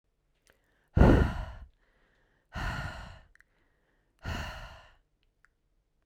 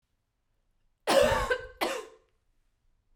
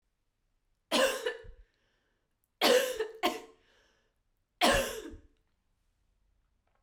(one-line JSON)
{"exhalation_length": "6.1 s", "exhalation_amplitude": 14440, "exhalation_signal_mean_std_ratio": 0.28, "cough_length": "3.2 s", "cough_amplitude": 9930, "cough_signal_mean_std_ratio": 0.37, "three_cough_length": "6.8 s", "three_cough_amplitude": 9766, "three_cough_signal_mean_std_ratio": 0.35, "survey_phase": "beta (2021-08-13 to 2022-03-07)", "age": "18-44", "gender": "Female", "wearing_mask": "No", "symptom_cough_any": true, "symptom_runny_or_blocked_nose": true, "symptom_shortness_of_breath": true, "symptom_fatigue": true, "symptom_headache": true, "symptom_change_to_sense_of_smell_or_taste": true, "symptom_loss_of_taste": true, "smoker_status": "Never smoked", "respiratory_condition_asthma": false, "respiratory_condition_other": false, "recruitment_source": "Test and Trace", "submission_delay": "2 days", "covid_test_result": "Positive", "covid_test_method": "RT-qPCR", "covid_ct_value": 18.8, "covid_ct_gene": "ORF1ab gene"}